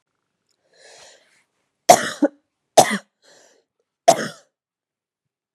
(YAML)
three_cough_length: 5.5 s
three_cough_amplitude: 32768
three_cough_signal_mean_std_ratio: 0.21
survey_phase: beta (2021-08-13 to 2022-03-07)
age: 18-44
gender: Female
wearing_mask: 'No'
symptom_cough_any: true
symptom_runny_or_blocked_nose: true
smoker_status: Never smoked
respiratory_condition_asthma: false
respiratory_condition_other: false
recruitment_source: REACT
submission_delay: 1 day
covid_test_result: Negative
covid_test_method: RT-qPCR
influenza_a_test_result: Negative
influenza_b_test_result: Negative